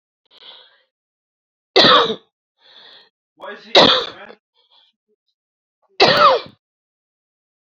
{
  "three_cough_length": "7.8 s",
  "three_cough_amplitude": 32313,
  "three_cough_signal_mean_std_ratio": 0.31,
  "survey_phase": "beta (2021-08-13 to 2022-03-07)",
  "age": "45-64",
  "gender": "Female",
  "wearing_mask": "No",
  "symptom_cough_any": true,
  "symptom_new_continuous_cough": true,
  "symptom_runny_or_blocked_nose": true,
  "symptom_shortness_of_breath": true,
  "symptom_sore_throat": true,
  "symptom_diarrhoea": true,
  "symptom_fatigue": true,
  "symptom_fever_high_temperature": true,
  "symptom_headache": true,
  "symptom_change_to_sense_of_smell_or_taste": true,
  "symptom_loss_of_taste": true,
  "symptom_other": true,
  "symptom_onset": "4 days",
  "smoker_status": "Ex-smoker",
  "respiratory_condition_asthma": false,
  "respiratory_condition_other": false,
  "recruitment_source": "Test and Trace",
  "submission_delay": "3 days",
  "covid_test_result": "Positive",
  "covid_test_method": "RT-qPCR",
  "covid_ct_value": 16.2,
  "covid_ct_gene": "ORF1ab gene",
  "covid_ct_mean": 16.9,
  "covid_viral_load": "3000000 copies/ml",
  "covid_viral_load_category": "High viral load (>1M copies/ml)"
}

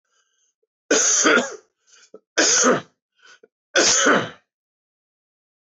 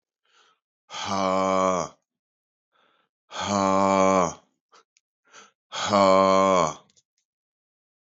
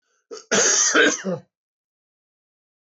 {
  "three_cough_length": "5.6 s",
  "three_cough_amplitude": 19936,
  "three_cough_signal_mean_std_ratio": 0.44,
  "exhalation_length": "8.2 s",
  "exhalation_amplitude": 16118,
  "exhalation_signal_mean_std_ratio": 0.44,
  "cough_length": "2.9 s",
  "cough_amplitude": 18348,
  "cough_signal_mean_std_ratio": 0.44,
  "survey_phase": "beta (2021-08-13 to 2022-03-07)",
  "age": "45-64",
  "gender": "Male",
  "wearing_mask": "No",
  "symptom_cough_any": true,
  "symptom_new_continuous_cough": true,
  "symptom_runny_or_blocked_nose": true,
  "symptom_shortness_of_breath": true,
  "symptom_sore_throat": true,
  "symptom_diarrhoea": true,
  "symptom_fatigue": true,
  "symptom_change_to_sense_of_smell_or_taste": true,
  "smoker_status": "Ex-smoker",
  "respiratory_condition_asthma": false,
  "respiratory_condition_other": false,
  "recruitment_source": "Test and Trace",
  "submission_delay": "1 day",
  "covid_test_result": "Positive",
  "covid_test_method": "RT-qPCR",
  "covid_ct_value": 16.3,
  "covid_ct_gene": "ORF1ab gene"
}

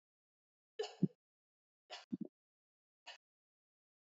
{
  "three_cough_length": "4.2 s",
  "three_cough_amplitude": 2621,
  "three_cough_signal_mean_std_ratio": 0.17,
  "survey_phase": "beta (2021-08-13 to 2022-03-07)",
  "age": "18-44",
  "gender": "Female",
  "wearing_mask": "No",
  "symptom_cough_any": true,
  "symptom_new_continuous_cough": true,
  "symptom_runny_or_blocked_nose": true,
  "symptom_sore_throat": true,
  "symptom_fatigue": true,
  "symptom_fever_high_temperature": true,
  "symptom_headache": true,
  "symptom_other": true,
  "symptom_onset": "3 days",
  "smoker_status": "Never smoked",
  "respiratory_condition_asthma": false,
  "respiratory_condition_other": false,
  "recruitment_source": "Test and Trace",
  "submission_delay": "2 days",
  "covid_test_result": "Positive",
  "covid_test_method": "RT-qPCR"
}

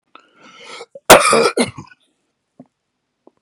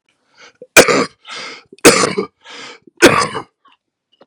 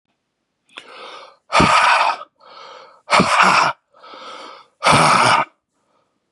{
  "cough_length": "3.4 s",
  "cough_amplitude": 32768,
  "cough_signal_mean_std_ratio": 0.3,
  "three_cough_length": "4.3 s",
  "three_cough_amplitude": 32768,
  "three_cough_signal_mean_std_ratio": 0.36,
  "exhalation_length": "6.3 s",
  "exhalation_amplitude": 32523,
  "exhalation_signal_mean_std_ratio": 0.49,
  "survey_phase": "beta (2021-08-13 to 2022-03-07)",
  "age": "45-64",
  "gender": "Male",
  "wearing_mask": "No",
  "symptom_cough_any": true,
  "symptom_new_continuous_cough": true,
  "symptom_runny_or_blocked_nose": true,
  "symptom_sore_throat": true,
  "symptom_headache": true,
  "symptom_onset": "3 days",
  "smoker_status": "Never smoked",
  "respiratory_condition_asthma": false,
  "respiratory_condition_other": false,
  "recruitment_source": "Test and Trace",
  "submission_delay": "1 day",
  "covid_test_result": "Positive",
  "covid_test_method": "LAMP"
}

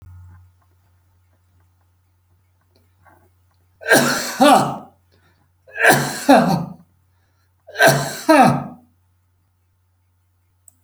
{
  "three_cough_length": "10.8 s",
  "three_cough_amplitude": 32767,
  "three_cough_signal_mean_std_ratio": 0.35,
  "survey_phase": "beta (2021-08-13 to 2022-03-07)",
  "age": "65+",
  "gender": "Male",
  "wearing_mask": "No",
  "symptom_none": true,
  "smoker_status": "Never smoked",
  "respiratory_condition_asthma": false,
  "respiratory_condition_other": false,
  "recruitment_source": "REACT",
  "submission_delay": "1 day",
  "covid_test_result": "Negative",
  "covid_test_method": "RT-qPCR"
}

